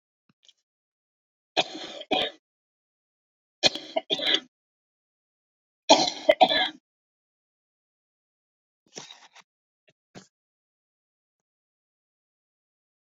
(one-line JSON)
{"three_cough_length": "13.1 s", "three_cough_amplitude": 26692, "three_cough_signal_mean_std_ratio": 0.22, "survey_phase": "beta (2021-08-13 to 2022-03-07)", "age": "65+", "gender": "Female", "wearing_mask": "No", "symptom_cough_any": true, "symptom_runny_or_blocked_nose": true, "symptom_fatigue": true, "symptom_onset": "10 days", "smoker_status": "Never smoked", "respiratory_condition_asthma": true, "respiratory_condition_other": false, "recruitment_source": "REACT", "submission_delay": "2 days", "covid_test_result": "Negative", "covid_test_method": "RT-qPCR"}